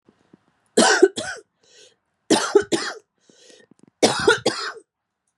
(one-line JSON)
{"three_cough_length": "5.4 s", "three_cough_amplitude": 30483, "three_cough_signal_mean_std_ratio": 0.37, "survey_phase": "beta (2021-08-13 to 2022-03-07)", "age": "18-44", "gender": "Female", "wearing_mask": "No", "symptom_cough_any": true, "symptom_shortness_of_breath": true, "symptom_fatigue": true, "symptom_change_to_sense_of_smell_or_taste": true, "symptom_onset": "5 days", "smoker_status": "Ex-smoker", "respiratory_condition_asthma": true, "respiratory_condition_other": false, "recruitment_source": "Test and Trace", "submission_delay": "2 days", "covid_test_result": "Positive", "covid_test_method": "RT-qPCR", "covid_ct_value": 18.2, "covid_ct_gene": "ORF1ab gene", "covid_ct_mean": 18.7, "covid_viral_load": "730000 copies/ml", "covid_viral_load_category": "Low viral load (10K-1M copies/ml)"}